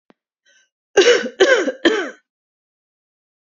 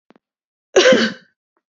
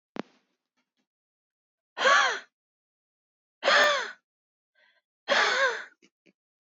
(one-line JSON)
{"three_cough_length": "3.4 s", "three_cough_amplitude": 28991, "three_cough_signal_mean_std_ratio": 0.38, "cough_length": "1.8 s", "cough_amplitude": 29417, "cough_signal_mean_std_ratio": 0.35, "exhalation_length": "6.7 s", "exhalation_amplitude": 11813, "exhalation_signal_mean_std_ratio": 0.36, "survey_phase": "beta (2021-08-13 to 2022-03-07)", "age": "18-44", "gender": "Female", "wearing_mask": "No", "symptom_none": true, "symptom_onset": "7 days", "smoker_status": "Never smoked", "respiratory_condition_asthma": true, "respiratory_condition_other": false, "recruitment_source": "REACT", "submission_delay": "1 day", "covid_test_result": "Negative", "covid_test_method": "RT-qPCR", "influenza_a_test_result": "Negative", "influenza_b_test_result": "Negative"}